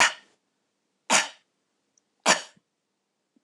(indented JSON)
{
  "three_cough_length": "3.4 s",
  "three_cough_amplitude": 19374,
  "three_cough_signal_mean_std_ratio": 0.26,
  "survey_phase": "beta (2021-08-13 to 2022-03-07)",
  "age": "45-64",
  "gender": "Female",
  "wearing_mask": "No",
  "symptom_none": true,
  "smoker_status": "Never smoked",
  "respiratory_condition_asthma": false,
  "respiratory_condition_other": false,
  "recruitment_source": "REACT",
  "submission_delay": "1 day",
  "covid_test_result": "Negative",
  "covid_test_method": "RT-qPCR",
  "influenza_a_test_result": "Negative",
  "influenza_b_test_result": "Negative"
}